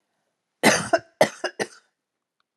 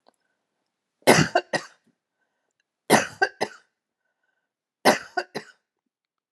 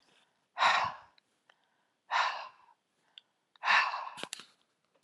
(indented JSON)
{
  "cough_length": "2.6 s",
  "cough_amplitude": 25182,
  "cough_signal_mean_std_ratio": 0.3,
  "three_cough_length": "6.3 s",
  "three_cough_amplitude": 28195,
  "three_cough_signal_mean_std_ratio": 0.25,
  "exhalation_length": "5.0 s",
  "exhalation_amplitude": 8633,
  "exhalation_signal_mean_std_ratio": 0.37,
  "survey_phase": "alpha (2021-03-01 to 2021-08-12)",
  "age": "45-64",
  "gender": "Female",
  "wearing_mask": "No",
  "symptom_none": true,
  "smoker_status": "Never smoked",
  "respiratory_condition_asthma": false,
  "respiratory_condition_other": false,
  "recruitment_source": "REACT",
  "submission_delay": "1 day",
  "covid_test_result": "Negative",
  "covid_test_method": "RT-qPCR"
}